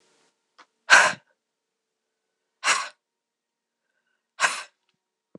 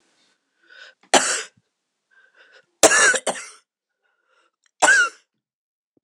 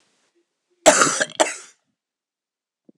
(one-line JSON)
{"exhalation_length": "5.4 s", "exhalation_amplitude": 26028, "exhalation_signal_mean_std_ratio": 0.23, "three_cough_length": "6.0 s", "three_cough_amplitude": 26028, "three_cough_signal_mean_std_ratio": 0.31, "cough_length": "3.0 s", "cough_amplitude": 26028, "cough_signal_mean_std_ratio": 0.29, "survey_phase": "beta (2021-08-13 to 2022-03-07)", "age": "65+", "gender": "Female", "wearing_mask": "No", "symptom_cough_any": true, "symptom_new_continuous_cough": true, "symptom_runny_or_blocked_nose": true, "symptom_fatigue": true, "symptom_headache": true, "symptom_onset": "2 days", "smoker_status": "Ex-smoker", "respiratory_condition_asthma": false, "respiratory_condition_other": true, "recruitment_source": "Test and Trace", "submission_delay": "1 day", "covid_test_result": "Positive", "covid_test_method": "ePCR"}